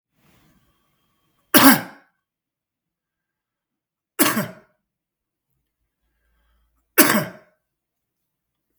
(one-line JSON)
{"three_cough_length": "8.8 s", "three_cough_amplitude": 32768, "three_cough_signal_mean_std_ratio": 0.22, "survey_phase": "beta (2021-08-13 to 2022-03-07)", "age": "18-44", "gender": "Male", "wearing_mask": "No", "symptom_none": true, "symptom_onset": "7 days", "smoker_status": "Ex-smoker", "respiratory_condition_asthma": true, "respiratory_condition_other": false, "recruitment_source": "REACT", "submission_delay": "2 days", "covid_test_result": "Negative", "covid_test_method": "RT-qPCR", "influenza_a_test_result": "Negative", "influenza_b_test_result": "Negative"}